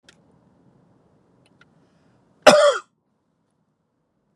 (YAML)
cough_length: 4.4 s
cough_amplitude: 32768
cough_signal_mean_std_ratio: 0.21
survey_phase: beta (2021-08-13 to 2022-03-07)
age: 18-44
gender: Male
wearing_mask: 'No'
symptom_none: true
symptom_onset: 7 days
smoker_status: Ex-smoker
respiratory_condition_asthma: false
respiratory_condition_other: false
recruitment_source: REACT
submission_delay: 2 days
covid_test_result: Negative
covid_test_method: RT-qPCR
influenza_a_test_result: Negative
influenza_b_test_result: Negative